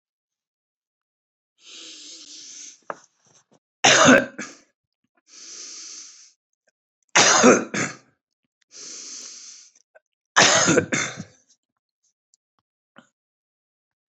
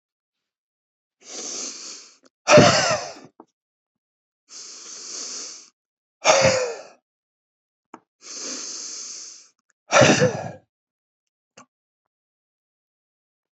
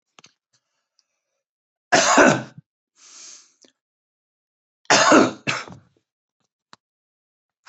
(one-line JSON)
{"three_cough_length": "14.1 s", "three_cough_amplitude": 29416, "three_cough_signal_mean_std_ratio": 0.29, "exhalation_length": "13.6 s", "exhalation_amplitude": 28040, "exhalation_signal_mean_std_ratio": 0.31, "cough_length": "7.7 s", "cough_amplitude": 30313, "cough_signal_mean_std_ratio": 0.28, "survey_phase": "beta (2021-08-13 to 2022-03-07)", "age": "65+", "gender": "Male", "wearing_mask": "No", "symptom_none": true, "symptom_onset": "13 days", "smoker_status": "Never smoked", "respiratory_condition_asthma": false, "respiratory_condition_other": false, "recruitment_source": "REACT", "submission_delay": "2 days", "covid_test_result": "Negative", "covid_test_method": "RT-qPCR", "influenza_a_test_result": "Negative", "influenza_b_test_result": "Negative"}